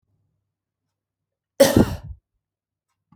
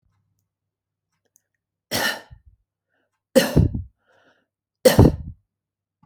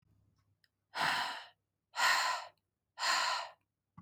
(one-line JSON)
{"cough_length": "3.2 s", "cough_amplitude": 27766, "cough_signal_mean_std_ratio": 0.23, "three_cough_length": "6.1 s", "three_cough_amplitude": 29305, "three_cough_signal_mean_std_ratio": 0.26, "exhalation_length": "4.0 s", "exhalation_amplitude": 4039, "exhalation_signal_mean_std_ratio": 0.49, "survey_phase": "beta (2021-08-13 to 2022-03-07)", "age": "18-44", "gender": "Female", "wearing_mask": "No", "symptom_none": true, "smoker_status": "Never smoked", "respiratory_condition_asthma": false, "respiratory_condition_other": false, "recruitment_source": "REACT", "submission_delay": "2 days", "covid_test_result": "Negative", "covid_test_method": "RT-qPCR"}